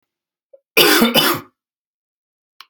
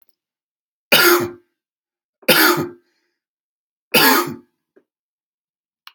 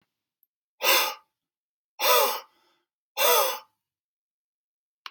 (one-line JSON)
{"cough_length": "2.7 s", "cough_amplitude": 32768, "cough_signal_mean_std_ratio": 0.38, "three_cough_length": "5.9 s", "three_cough_amplitude": 32768, "three_cough_signal_mean_std_ratio": 0.34, "exhalation_length": "5.1 s", "exhalation_amplitude": 14390, "exhalation_signal_mean_std_ratio": 0.37, "survey_phase": "alpha (2021-03-01 to 2021-08-12)", "age": "45-64", "gender": "Male", "wearing_mask": "No", "symptom_none": true, "smoker_status": "Ex-smoker", "respiratory_condition_asthma": false, "respiratory_condition_other": false, "recruitment_source": "REACT", "submission_delay": "2 days", "covid_test_result": "Negative", "covid_test_method": "RT-qPCR"}